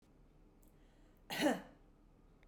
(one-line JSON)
{"cough_length": "2.5 s", "cough_amplitude": 2443, "cough_signal_mean_std_ratio": 0.33, "survey_phase": "beta (2021-08-13 to 2022-03-07)", "age": "45-64", "gender": "Female", "wearing_mask": "No", "symptom_none": true, "smoker_status": "Ex-smoker", "respiratory_condition_asthma": false, "respiratory_condition_other": false, "recruitment_source": "REACT", "submission_delay": "1 day", "covid_test_result": "Negative", "covid_test_method": "RT-qPCR", "influenza_a_test_result": "Negative", "influenza_b_test_result": "Negative"}